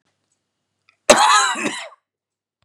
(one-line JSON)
{"cough_length": "2.6 s", "cough_amplitude": 32768, "cough_signal_mean_std_ratio": 0.36, "survey_phase": "beta (2021-08-13 to 2022-03-07)", "age": "45-64", "gender": "Male", "wearing_mask": "No", "symptom_none": true, "smoker_status": "Ex-smoker", "respiratory_condition_asthma": false, "respiratory_condition_other": false, "recruitment_source": "REACT", "submission_delay": "2 days", "covid_test_result": "Negative", "covid_test_method": "RT-qPCR", "influenza_a_test_result": "Negative", "influenza_b_test_result": "Negative"}